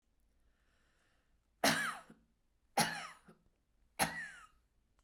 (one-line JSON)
{"three_cough_length": "5.0 s", "three_cough_amplitude": 4959, "three_cough_signal_mean_std_ratio": 0.31, "survey_phase": "beta (2021-08-13 to 2022-03-07)", "age": "45-64", "gender": "Female", "wearing_mask": "No", "symptom_none": true, "smoker_status": "Never smoked", "respiratory_condition_asthma": true, "respiratory_condition_other": false, "recruitment_source": "REACT", "submission_delay": "1 day", "covid_test_result": "Negative", "covid_test_method": "RT-qPCR"}